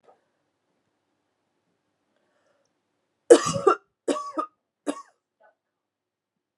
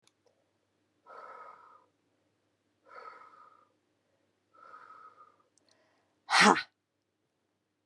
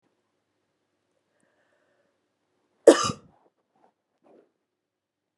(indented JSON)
{
  "three_cough_length": "6.6 s",
  "three_cough_amplitude": 32669,
  "three_cough_signal_mean_std_ratio": 0.19,
  "exhalation_length": "7.9 s",
  "exhalation_amplitude": 15782,
  "exhalation_signal_mean_std_ratio": 0.18,
  "cough_length": "5.4 s",
  "cough_amplitude": 30581,
  "cough_signal_mean_std_ratio": 0.12,
  "survey_phase": "beta (2021-08-13 to 2022-03-07)",
  "age": "18-44",
  "gender": "Female",
  "wearing_mask": "No",
  "symptom_cough_any": true,
  "symptom_runny_or_blocked_nose": true,
  "symptom_headache": true,
  "symptom_change_to_sense_of_smell_or_taste": true,
  "symptom_onset": "5 days",
  "smoker_status": "Never smoked",
  "respiratory_condition_asthma": false,
  "respiratory_condition_other": false,
  "recruitment_source": "Test and Trace",
  "submission_delay": "2 days",
  "covid_test_result": "Positive",
  "covid_test_method": "RT-qPCR",
  "covid_ct_value": 21.1,
  "covid_ct_gene": "N gene"
}